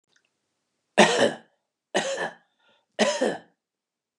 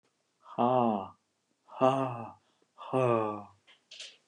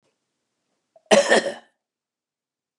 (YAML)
three_cough_length: 4.2 s
three_cough_amplitude: 26348
three_cough_signal_mean_std_ratio: 0.35
exhalation_length: 4.3 s
exhalation_amplitude: 9914
exhalation_signal_mean_std_ratio: 0.45
cough_length: 2.8 s
cough_amplitude: 31907
cough_signal_mean_std_ratio: 0.27
survey_phase: beta (2021-08-13 to 2022-03-07)
age: 65+
gender: Male
wearing_mask: 'No'
symptom_none: true
smoker_status: Ex-smoker
respiratory_condition_asthma: false
respiratory_condition_other: false
recruitment_source: REACT
submission_delay: 3 days
covid_test_result: Negative
covid_test_method: RT-qPCR
influenza_a_test_result: Negative
influenza_b_test_result: Negative